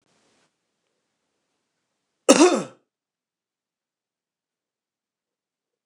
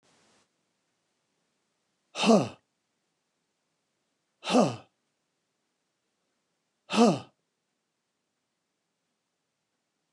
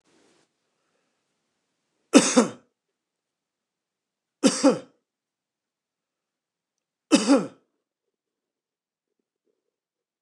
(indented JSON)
{
  "cough_length": "5.9 s",
  "cough_amplitude": 29204,
  "cough_signal_mean_std_ratio": 0.17,
  "exhalation_length": "10.1 s",
  "exhalation_amplitude": 13526,
  "exhalation_signal_mean_std_ratio": 0.21,
  "three_cough_length": "10.2 s",
  "three_cough_amplitude": 27481,
  "three_cough_signal_mean_std_ratio": 0.21,
  "survey_phase": "beta (2021-08-13 to 2022-03-07)",
  "age": "65+",
  "gender": "Male",
  "wearing_mask": "No",
  "symptom_none": true,
  "smoker_status": "Ex-smoker",
  "respiratory_condition_asthma": false,
  "respiratory_condition_other": false,
  "recruitment_source": "REACT",
  "submission_delay": "1 day",
  "covid_test_result": "Negative",
  "covid_test_method": "RT-qPCR"
}